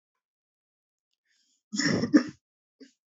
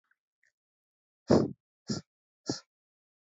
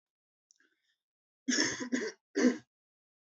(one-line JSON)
{"cough_length": "3.1 s", "cough_amplitude": 14360, "cough_signal_mean_std_ratio": 0.27, "exhalation_length": "3.2 s", "exhalation_amplitude": 11009, "exhalation_signal_mean_std_ratio": 0.23, "three_cough_length": "3.3 s", "three_cough_amplitude": 6545, "three_cough_signal_mean_std_ratio": 0.36, "survey_phase": "alpha (2021-03-01 to 2021-08-12)", "age": "18-44", "gender": "Male", "wearing_mask": "No", "symptom_cough_any": true, "symptom_headache": true, "symptom_change_to_sense_of_smell_or_taste": true, "symptom_onset": "2 days", "smoker_status": "Never smoked", "respiratory_condition_asthma": false, "respiratory_condition_other": false, "recruitment_source": "Test and Trace", "submission_delay": "1 day", "covid_test_result": "Positive", "covid_test_method": "RT-qPCR", "covid_ct_value": 14.6, "covid_ct_gene": "ORF1ab gene", "covid_ct_mean": 15.3, "covid_viral_load": "9500000 copies/ml", "covid_viral_load_category": "High viral load (>1M copies/ml)"}